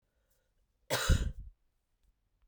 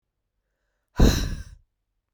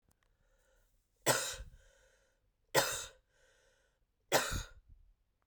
{"cough_length": "2.5 s", "cough_amplitude": 6297, "cough_signal_mean_std_ratio": 0.3, "exhalation_length": "2.1 s", "exhalation_amplitude": 20631, "exhalation_signal_mean_std_ratio": 0.3, "three_cough_length": "5.5 s", "three_cough_amplitude": 7627, "three_cough_signal_mean_std_ratio": 0.31, "survey_phase": "beta (2021-08-13 to 2022-03-07)", "age": "18-44", "gender": "Female", "wearing_mask": "No", "symptom_cough_any": true, "symptom_runny_or_blocked_nose": true, "symptom_fatigue": true, "symptom_headache": true, "symptom_change_to_sense_of_smell_or_taste": true, "symptom_onset": "3 days", "smoker_status": "Never smoked", "respiratory_condition_asthma": true, "respiratory_condition_other": false, "recruitment_source": "Test and Trace", "submission_delay": "1 day", "covid_test_result": "Positive", "covid_test_method": "RT-qPCR", "covid_ct_value": 21.1, "covid_ct_gene": "N gene", "covid_ct_mean": 21.8, "covid_viral_load": "71000 copies/ml", "covid_viral_load_category": "Low viral load (10K-1M copies/ml)"}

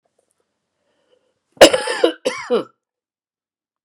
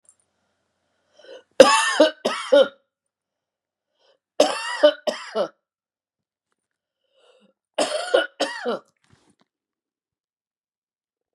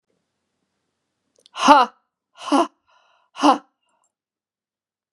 {"cough_length": "3.8 s", "cough_amplitude": 32768, "cough_signal_mean_std_ratio": 0.26, "three_cough_length": "11.3 s", "three_cough_amplitude": 32768, "three_cough_signal_mean_std_ratio": 0.29, "exhalation_length": "5.1 s", "exhalation_amplitude": 32767, "exhalation_signal_mean_std_ratio": 0.25, "survey_phase": "beta (2021-08-13 to 2022-03-07)", "age": "45-64", "gender": "Female", "wearing_mask": "No", "symptom_runny_or_blocked_nose": true, "symptom_loss_of_taste": true, "symptom_onset": "4 days", "smoker_status": "Never smoked", "respiratory_condition_asthma": true, "respiratory_condition_other": false, "recruitment_source": "Test and Trace", "submission_delay": "1 day", "covid_test_result": "Positive", "covid_test_method": "RT-qPCR", "covid_ct_value": 20.5, "covid_ct_gene": "ORF1ab gene"}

